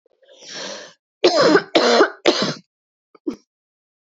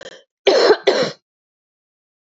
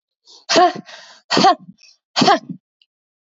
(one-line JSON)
{"three_cough_length": "4.1 s", "three_cough_amplitude": 32767, "three_cough_signal_mean_std_ratio": 0.42, "cough_length": "2.4 s", "cough_amplitude": 28361, "cough_signal_mean_std_ratio": 0.39, "exhalation_length": "3.3 s", "exhalation_amplitude": 28639, "exhalation_signal_mean_std_ratio": 0.39, "survey_phase": "beta (2021-08-13 to 2022-03-07)", "age": "18-44", "gender": "Female", "wearing_mask": "No", "symptom_cough_any": true, "symptom_new_continuous_cough": true, "symptom_runny_or_blocked_nose": true, "symptom_shortness_of_breath": true, "symptom_sore_throat": true, "symptom_fatigue": true, "symptom_fever_high_temperature": true, "symptom_headache": true, "symptom_change_to_sense_of_smell_or_taste": true, "symptom_loss_of_taste": true, "symptom_other": true, "symptom_onset": "3 days", "smoker_status": "Never smoked", "respiratory_condition_asthma": true, "respiratory_condition_other": false, "recruitment_source": "Test and Trace", "submission_delay": "2 days", "covid_test_result": "Positive", "covid_test_method": "RT-qPCR", "covid_ct_value": 22.6, "covid_ct_gene": "ORF1ab gene", "covid_ct_mean": 23.6, "covid_viral_load": "19000 copies/ml", "covid_viral_load_category": "Low viral load (10K-1M copies/ml)"}